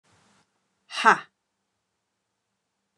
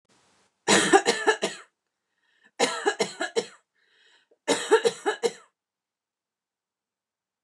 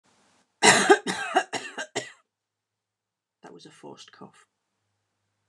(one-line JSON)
{"exhalation_length": "3.0 s", "exhalation_amplitude": 25291, "exhalation_signal_mean_std_ratio": 0.17, "three_cough_length": "7.4 s", "three_cough_amplitude": 20556, "three_cough_signal_mean_std_ratio": 0.35, "cough_length": "5.5 s", "cough_amplitude": 26646, "cough_signal_mean_std_ratio": 0.27, "survey_phase": "beta (2021-08-13 to 2022-03-07)", "age": "45-64", "gender": "Female", "wearing_mask": "No", "symptom_runny_or_blocked_nose": true, "symptom_fatigue": true, "symptom_onset": "12 days", "smoker_status": "Never smoked", "respiratory_condition_asthma": false, "respiratory_condition_other": false, "recruitment_source": "REACT", "submission_delay": "1 day", "covid_test_result": "Negative", "covid_test_method": "RT-qPCR", "influenza_a_test_result": "Negative", "influenza_b_test_result": "Negative"}